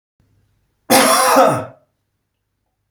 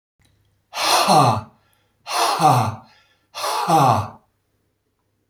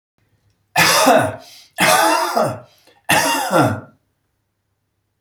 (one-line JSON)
{"cough_length": "2.9 s", "cough_amplitude": 32768, "cough_signal_mean_std_ratio": 0.42, "exhalation_length": "5.3 s", "exhalation_amplitude": 25908, "exhalation_signal_mean_std_ratio": 0.5, "three_cough_length": "5.2 s", "three_cough_amplitude": 32187, "three_cough_signal_mean_std_ratio": 0.53, "survey_phase": "beta (2021-08-13 to 2022-03-07)", "age": "45-64", "gender": "Male", "wearing_mask": "No", "symptom_none": true, "smoker_status": "Never smoked", "respiratory_condition_asthma": false, "respiratory_condition_other": false, "recruitment_source": "REACT", "submission_delay": "1 day", "covid_test_result": "Negative", "covid_test_method": "RT-qPCR", "influenza_a_test_result": "Negative", "influenza_b_test_result": "Negative"}